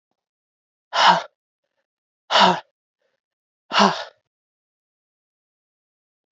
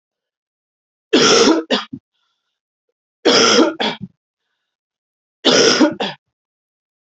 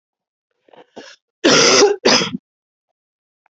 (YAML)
exhalation_length: 6.3 s
exhalation_amplitude: 27536
exhalation_signal_mean_std_ratio: 0.27
three_cough_length: 7.1 s
three_cough_amplitude: 32768
three_cough_signal_mean_std_ratio: 0.42
cough_length: 3.6 s
cough_amplitude: 32767
cough_signal_mean_std_ratio: 0.39
survey_phase: beta (2021-08-13 to 2022-03-07)
age: 18-44
gender: Female
wearing_mask: 'No'
symptom_cough_any: true
symptom_new_continuous_cough: true
symptom_runny_or_blocked_nose: true
symptom_abdominal_pain: true
symptom_diarrhoea: true
symptom_fatigue: true
symptom_headache: true
symptom_onset: 4 days
smoker_status: Never smoked
respiratory_condition_asthma: false
respiratory_condition_other: false
recruitment_source: Test and Trace
submission_delay: 2 days
covid_test_result: Positive
covid_test_method: RT-qPCR
covid_ct_value: 16.0
covid_ct_gene: ORF1ab gene